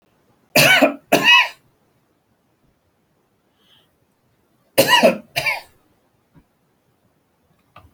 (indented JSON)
{
  "cough_length": "7.9 s",
  "cough_amplitude": 32768,
  "cough_signal_mean_std_ratio": 0.31,
  "survey_phase": "beta (2021-08-13 to 2022-03-07)",
  "age": "65+",
  "gender": "Male",
  "wearing_mask": "No",
  "symptom_none": true,
  "smoker_status": "Ex-smoker",
  "respiratory_condition_asthma": false,
  "respiratory_condition_other": false,
  "recruitment_source": "REACT",
  "submission_delay": "2 days",
  "covid_test_result": "Negative",
  "covid_test_method": "RT-qPCR"
}